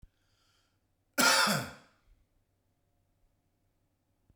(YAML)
cough_length: 4.4 s
cough_amplitude: 8032
cough_signal_mean_std_ratio: 0.27
survey_phase: beta (2021-08-13 to 2022-03-07)
age: 45-64
gender: Male
wearing_mask: 'No'
symptom_none: true
smoker_status: Ex-smoker
respiratory_condition_asthma: false
respiratory_condition_other: false
recruitment_source: REACT
submission_delay: 3 days
covid_test_result: Negative
covid_test_method: RT-qPCR